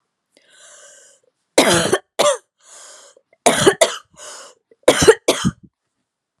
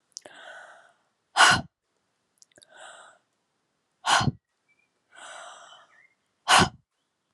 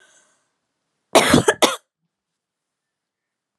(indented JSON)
{
  "three_cough_length": "6.4 s",
  "three_cough_amplitude": 32768,
  "three_cough_signal_mean_std_ratio": 0.36,
  "exhalation_length": "7.3 s",
  "exhalation_amplitude": 20532,
  "exhalation_signal_mean_std_ratio": 0.26,
  "cough_length": "3.6 s",
  "cough_amplitude": 32767,
  "cough_signal_mean_std_ratio": 0.26,
  "survey_phase": "alpha (2021-03-01 to 2021-08-12)",
  "age": "18-44",
  "gender": "Female",
  "wearing_mask": "No",
  "symptom_none": true,
  "smoker_status": "Never smoked",
  "respiratory_condition_asthma": false,
  "respiratory_condition_other": false,
  "recruitment_source": "Test and Trace",
  "submission_delay": "2 days",
  "covid_test_result": "Positive",
  "covid_test_method": "RT-qPCR"
}